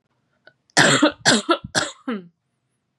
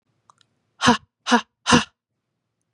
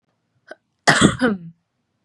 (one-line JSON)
{"three_cough_length": "3.0 s", "three_cough_amplitude": 32488, "three_cough_signal_mean_std_ratio": 0.41, "exhalation_length": "2.7 s", "exhalation_amplitude": 30004, "exhalation_signal_mean_std_ratio": 0.3, "cough_length": "2.0 s", "cough_amplitude": 32768, "cough_signal_mean_std_ratio": 0.36, "survey_phase": "beta (2021-08-13 to 2022-03-07)", "age": "18-44", "gender": "Female", "wearing_mask": "No", "symptom_sore_throat": true, "symptom_onset": "4 days", "smoker_status": "Never smoked", "respiratory_condition_asthma": false, "respiratory_condition_other": false, "recruitment_source": "REACT", "submission_delay": "1 day", "covid_test_result": "Negative", "covid_test_method": "RT-qPCR", "influenza_a_test_result": "Negative", "influenza_b_test_result": "Negative"}